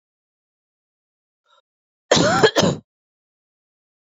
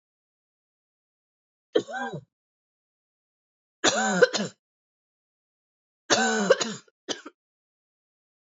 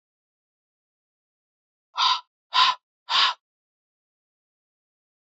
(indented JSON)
{
  "cough_length": "4.2 s",
  "cough_amplitude": 31413,
  "cough_signal_mean_std_ratio": 0.29,
  "three_cough_length": "8.4 s",
  "three_cough_amplitude": 20632,
  "three_cough_signal_mean_std_ratio": 0.3,
  "exhalation_length": "5.3 s",
  "exhalation_amplitude": 17921,
  "exhalation_signal_mean_std_ratio": 0.27,
  "survey_phase": "beta (2021-08-13 to 2022-03-07)",
  "age": "18-44",
  "gender": "Female",
  "wearing_mask": "No",
  "symptom_cough_any": true,
  "symptom_runny_or_blocked_nose": true,
  "symptom_sore_throat": true,
  "symptom_fatigue": true,
  "symptom_fever_high_temperature": true,
  "symptom_headache": true,
  "symptom_onset": "3 days",
  "smoker_status": "Never smoked",
  "respiratory_condition_asthma": false,
  "respiratory_condition_other": false,
  "recruitment_source": "Test and Trace",
  "submission_delay": "2 days",
  "covid_test_result": "Positive",
  "covid_test_method": "RT-qPCR",
  "covid_ct_value": 17.7,
  "covid_ct_gene": "ORF1ab gene",
  "covid_ct_mean": 18.3,
  "covid_viral_load": "990000 copies/ml",
  "covid_viral_load_category": "Low viral load (10K-1M copies/ml)"
}